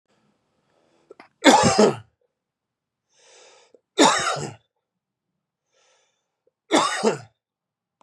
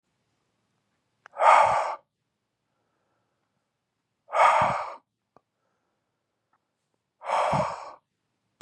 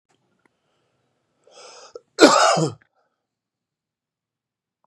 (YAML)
three_cough_length: 8.0 s
three_cough_amplitude: 32659
three_cough_signal_mean_std_ratio: 0.31
exhalation_length: 8.6 s
exhalation_amplitude: 22643
exhalation_signal_mean_std_ratio: 0.32
cough_length: 4.9 s
cough_amplitude: 32768
cough_signal_mean_std_ratio: 0.24
survey_phase: beta (2021-08-13 to 2022-03-07)
age: 45-64
gender: Male
wearing_mask: 'No'
symptom_runny_or_blocked_nose: true
symptom_shortness_of_breath: true
symptom_sore_throat: true
symptom_fatigue: true
symptom_headache: true
smoker_status: Ex-smoker
respiratory_condition_asthma: false
respiratory_condition_other: false
recruitment_source: Test and Trace
submission_delay: 2 days
covid_test_result: Positive
covid_test_method: RT-qPCR
covid_ct_value: 23.5
covid_ct_gene: ORF1ab gene
covid_ct_mean: 24.7
covid_viral_load: 8000 copies/ml
covid_viral_load_category: Minimal viral load (< 10K copies/ml)